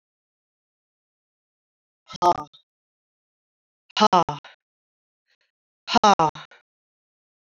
{"exhalation_length": "7.4 s", "exhalation_amplitude": 25301, "exhalation_signal_mean_std_ratio": 0.22, "survey_phase": "beta (2021-08-13 to 2022-03-07)", "age": "45-64", "gender": "Female", "wearing_mask": "No", "symptom_cough_any": true, "symptom_sore_throat": true, "symptom_fatigue": true, "symptom_headache": true, "smoker_status": "Never smoked", "respiratory_condition_asthma": true, "respiratory_condition_other": false, "recruitment_source": "Test and Trace", "submission_delay": "2 days", "covid_test_result": "Positive", "covid_test_method": "RT-qPCR"}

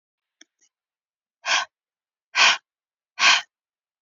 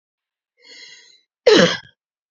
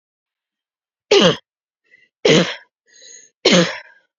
{"exhalation_length": "4.0 s", "exhalation_amplitude": 23736, "exhalation_signal_mean_std_ratio": 0.29, "cough_length": "2.3 s", "cough_amplitude": 28805, "cough_signal_mean_std_ratio": 0.29, "three_cough_length": "4.2 s", "three_cough_amplitude": 31796, "three_cough_signal_mean_std_ratio": 0.35, "survey_phase": "alpha (2021-03-01 to 2021-08-12)", "age": "18-44", "gender": "Female", "wearing_mask": "No", "symptom_shortness_of_breath": true, "symptom_fatigue": true, "symptom_headache": true, "symptom_change_to_sense_of_smell_or_taste": true, "symptom_onset": "4 days", "smoker_status": "Never smoked", "respiratory_condition_asthma": true, "respiratory_condition_other": false, "recruitment_source": "Test and Trace", "submission_delay": "3 days", "covid_test_result": "Positive", "covid_test_method": "RT-qPCR", "covid_ct_value": 29.7, "covid_ct_gene": "ORF1ab gene"}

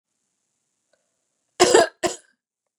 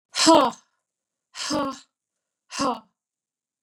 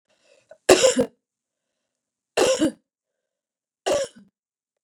{"cough_length": "2.8 s", "cough_amplitude": 32767, "cough_signal_mean_std_ratio": 0.26, "exhalation_length": "3.6 s", "exhalation_amplitude": 26022, "exhalation_signal_mean_std_ratio": 0.33, "three_cough_length": "4.8 s", "three_cough_amplitude": 30323, "three_cough_signal_mean_std_ratio": 0.31, "survey_phase": "beta (2021-08-13 to 2022-03-07)", "age": "45-64", "gender": "Female", "wearing_mask": "No", "symptom_cough_any": true, "symptom_runny_or_blocked_nose": true, "symptom_change_to_sense_of_smell_or_taste": true, "symptom_loss_of_taste": true, "symptom_onset": "2 days", "smoker_status": "Never smoked", "respiratory_condition_asthma": false, "respiratory_condition_other": false, "recruitment_source": "Test and Trace", "submission_delay": "1 day", "covid_test_result": "Positive", "covid_test_method": "RT-qPCR"}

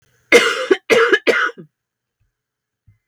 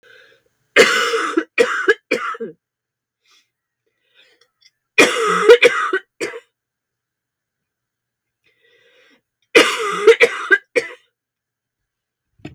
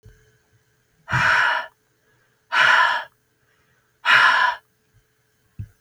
{"cough_length": "3.1 s", "cough_amplitude": 32768, "cough_signal_mean_std_ratio": 0.42, "three_cough_length": "12.5 s", "three_cough_amplitude": 32768, "three_cough_signal_mean_std_ratio": 0.35, "exhalation_length": "5.8 s", "exhalation_amplitude": 28815, "exhalation_signal_mean_std_ratio": 0.43, "survey_phase": "beta (2021-08-13 to 2022-03-07)", "age": "45-64", "gender": "Female", "wearing_mask": "No", "symptom_cough_any": true, "symptom_runny_or_blocked_nose": true, "symptom_sore_throat": true, "smoker_status": "Never smoked", "respiratory_condition_asthma": false, "respiratory_condition_other": false, "recruitment_source": "Test and Trace", "submission_delay": "2 days", "covid_test_result": "Positive", "covid_test_method": "LFT"}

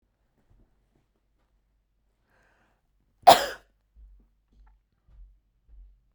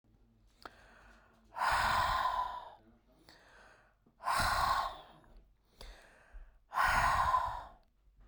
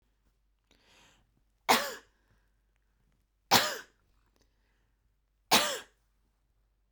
{"cough_length": "6.1 s", "cough_amplitude": 32439, "cough_signal_mean_std_ratio": 0.13, "exhalation_length": "8.3 s", "exhalation_amplitude": 4409, "exhalation_signal_mean_std_ratio": 0.52, "three_cough_length": "6.9 s", "three_cough_amplitude": 15224, "three_cough_signal_mean_std_ratio": 0.23, "survey_phase": "beta (2021-08-13 to 2022-03-07)", "age": "45-64", "gender": "Female", "wearing_mask": "No", "symptom_none": true, "smoker_status": "Never smoked", "respiratory_condition_asthma": false, "respiratory_condition_other": false, "recruitment_source": "REACT", "submission_delay": "1 day", "covid_test_result": "Negative", "covid_test_method": "RT-qPCR"}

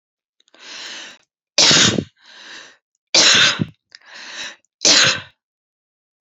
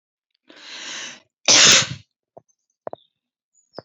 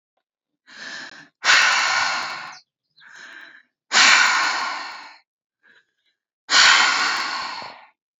{"three_cough_length": "6.2 s", "three_cough_amplitude": 32768, "three_cough_signal_mean_std_ratio": 0.39, "cough_length": "3.8 s", "cough_amplitude": 31665, "cough_signal_mean_std_ratio": 0.29, "exhalation_length": "8.2 s", "exhalation_amplitude": 28380, "exhalation_signal_mean_std_ratio": 0.48, "survey_phase": "beta (2021-08-13 to 2022-03-07)", "age": "18-44", "gender": "Female", "wearing_mask": "No", "symptom_cough_any": true, "symptom_runny_or_blocked_nose": true, "symptom_onset": "12 days", "smoker_status": "Ex-smoker", "respiratory_condition_asthma": false, "respiratory_condition_other": false, "recruitment_source": "REACT", "submission_delay": "2 days", "covid_test_result": "Negative", "covid_test_method": "RT-qPCR", "influenza_a_test_result": "Negative", "influenza_b_test_result": "Negative"}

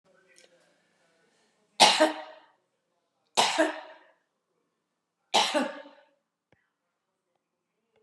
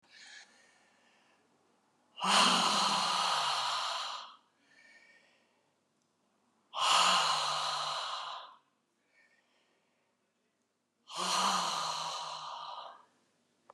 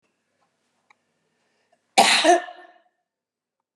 {"three_cough_length": "8.0 s", "three_cough_amplitude": 22402, "three_cough_signal_mean_std_ratio": 0.27, "exhalation_length": "13.7 s", "exhalation_amplitude": 6840, "exhalation_signal_mean_std_ratio": 0.5, "cough_length": "3.8 s", "cough_amplitude": 29694, "cough_signal_mean_std_ratio": 0.27, "survey_phase": "beta (2021-08-13 to 2022-03-07)", "age": "65+", "gender": "Female", "wearing_mask": "No", "symptom_none": true, "smoker_status": "Ex-smoker", "respiratory_condition_asthma": false, "respiratory_condition_other": false, "recruitment_source": "REACT", "submission_delay": "4 days", "covid_test_result": "Negative", "covid_test_method": "RT-qPCR"}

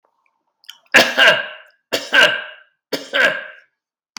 {"three_cough_length": "4.2 s", "three_cough_amplitude": 32768, "three_cough_signal_mean_std_ratio": 0.41, "survey_phase": "beta (2021-08-13 to 2022-03-07)", "age": "18-44", "gender": "Male", "wearing_mask": "No", "symptom_none": true, "smoker_status": "Never smoked", "respiratory_condition_asthma": false, "respiratory_condition_other": false, "recruitment_source": "Test and Trace", "submission_delay": "-1 day", "covid_test_result": "Negative", "covid_test_method": "LFT"}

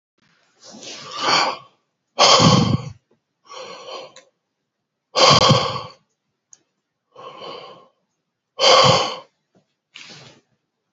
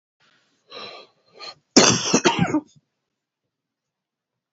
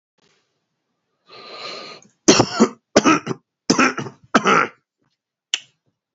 {"exhalation_length": "10.9 s", "exhalation_amplitude": 32768, "exhalation_signal_mean_std_ratio": 0.37, "cough_length": "4.5 s", "cough_amplitude": 29064, "cough_signal_mean_std_ratio": 0.31, "three_cough_length": "6.1 s", "three_cough_amplitude": 31344, "three_cough_signal_mean_std_ratio": 0.34, "survey_phase": "beta (2021-08-13 to 2022-03-07)", "age": "45-64", "gender": "Male", "wearing_mask": "No", "symptom_cough_any": true, "symptom_runny_or_blocked_nose": true, "symptom_fatigue": true, "symptom_change_to_sense_of_smell_or_taste": true, "smoker_status": "Current smoker (11 or more cigarettes per day)", "respiratory_condition_asthma": false, "respiratory_condition_other": false, "recruitment_source": "Test and Trace", "submission_delay": "1 day", "covid_test_result": "Positive", "covid_test_method": "RT-qPCR", "covid_ct_value": 19.4, "covid_ct_gene": "ORF1ab gene"}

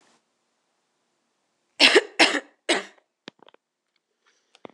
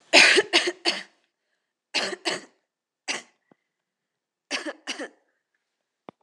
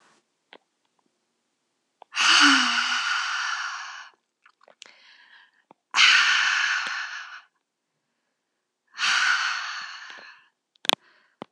{"three_cough_length": "4.7 s", "three_cough_amplitude": 26028, "three_cough_signal_mean_std_ratio": 0.24, "cough_length": "6.2 s", "cough_amplitude": 26028, "cough_signal_mean_std_ratio": 0.3, "exhalation_length": "11.5 s", "exhalation_amplitude": 26028, "exhalation_signal_mean_std_ratio": 0.44, "survey_phase": "alpha (2021-03-01 to 2021-08-12)", "age": "18-44", "gender": "Female", "wearing_mask": "No", "symptom_cough_any": true, "symptom_onset": "6 days", "smoker_status": "Never smoked", "respiratory_condition_asthma": false, "respiratory_condition_other": false, "recruitment_source": "Test and Trace", "submission_delay": "2 days", "covid_test_result": "Positive", "covid_test_method": "RT-qPCR", "covid_ct_value": 19.8, "covid_ct_gene": "N gene", "covid_ct_mean": 21.0, "covid_viral_load": "130000 copies/ml", "covid_viral_load_category": "Low viral load (10K-1M copies/ml)"}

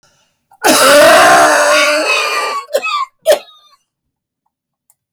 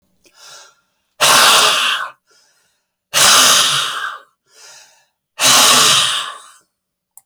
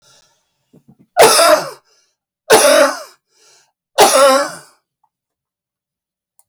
{"cough_length": "5.1 s", "cough_amplitude": 32768, "cough_signal_mean_std_ratio": 0.62, "exhalation_length": "7.3 s", "exhalation_amplitude": 32768, "exhalation_signal_mean_std_ratio": 0.52, "three_cough_length": "6.5 s", "three_cough_amplitude": 32768, "three_cough_signal_mean_std_ratio": 0.4, "survey_phase": "beta (2021-08-13 to 2022-03-07)", "age": "65+", "gender": "Male", "wearing_mask": "No", "symptom_cough_any": true, "smoker_status": "Never smoked", "respiratory_condition_asthma": false, "respiratory_condition_other": false, "recruitment_source": "REACT", "submission_delay": "1 day", "covid_test_result": "Negative", "covid_test_method": "RT-qPCR"}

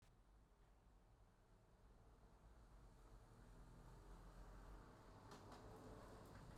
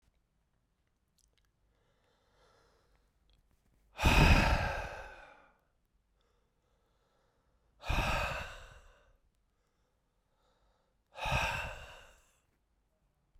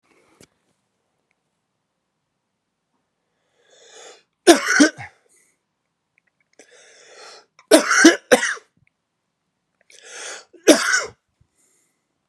{"cough_length": "6.6 s", "cough_amplitude": 140, "cough_signal_mean_std_ratio": 1.06, "exhalation_length": "13.4 s", "exhalation_amplitude": 8360, "exhalation_signal_mean_std_ratio": 0.29, "three_cough_length": "12.3 s", "three_cough_amplitude": 32768, "three_cough_signal_mean_std_ratio": 0.24, "survey_phase": "beta (2021-08-13 to 2022-03-07)", "age": "45-64", "gender": "Male", "wearing_mask": "No", "symptom_cough_any": true, "symptom_new_continuous_cough": true, "symptom_headache": true, "symptom_change_to_sense_of_smell_or_taste": true, "symptom_loss_of_taste": true, "symptom_onset": "4 days", "smoker_status": "Ex-smoker", "respiratory_condition_asthma": false, "respiratory_condition_other": false, "recruitment_source": "Test and Trace", "submission_delay": "2 days", "covid_test_result": "Positive", "covid_test_method": "RT-qPCR", "covid_ct_value": 17.5, "covid_ct_gene": "ORF1ab gene", "covid_ct_mean": 18.1, "covid_viral_load": "1200000 copies/ml", "covid_viral_load_category": "High viral load (>1M copies/ml)"}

